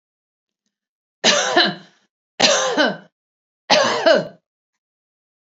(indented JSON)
{
  "three_cough_length": "5.5 s",
  "three_cough_amplitude": 32768,
  "three_cough_signal_mean_std_ratio": 0.43,
  "survey_phase": "beta (2021-08-13 to 2022-03-07)",
  "age": "45-64",
  "gender": "Female",
  "wearing_mask": "No",
  "symptom_none": true,
  "symptom_onset": "13 days",
  "smoker_status": "Ex-smoker",
  "respiratory_condition_asthma": false,
  "respiratory_condition_other": false,
  "recruitment_source": "REACT",
  "submission_delay": "3 days",
  "covid_test_result": "Negative",
  "covid_test_method": "RT-qPCR",
  "influenza_a_test_result": "Negative",
  "influenza_b_test_result": "Negative"
}